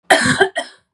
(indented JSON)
{
  "cough_length": "0.9 s",
  "cough_amplitude": 32768,
  "cough_signal_mean_std_ratio": 0.56,
  "survey_phase": "beta (2021-08-13 to 2022-03-07)",
  "age": "18-44",
  "gender": "Female",
  "wearing_mask": "No",
  "symptom_none": true,
  "smoker_status": "Never smoked",
  "respiratory_condition_asthma": false,
  "respiratory_condition_other": false,
  "recruitment_source": "REACT",
  "submission_delay": "1 day",
  "covid_test_result": "Negative",
  "covid_test_method": "RT-qPCR",
  "influenza_a_test_result": "Negative",
  "influenza_b_test_result": "Negative"
}